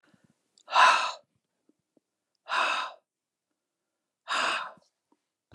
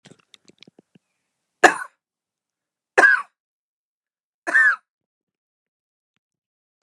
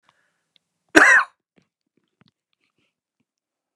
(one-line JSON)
{"exhalation_length": "5.5 s", "exhalation_amplitude": 15982, "exhalation_signal_mean_std_ratio": 0.33, "three_cough_length": "6.8 s", "three_cough_amplitude": 32768, "three_cough_signal_mean_std_ratio": 0.22, "cough_length": "3.8 s", "cough_amplitude": 32768, "cough_signal_mean_std_ratio": 0.22, "survey_phase": "alpha (2021-03-01 to 2021-08-12)", "age": "65+", "gender": "Female", "wearing_mask": "No", "symptom_none": true, "smoker_status": "Ex-smoker", "respiratory_condition_asthma": false, "respiratory_condition_other": false, "recruitment_source": "REACT", "submission_delay": "24 days", "covid_test_result": "Negative", "covid_test_method": "RT-qPCR"}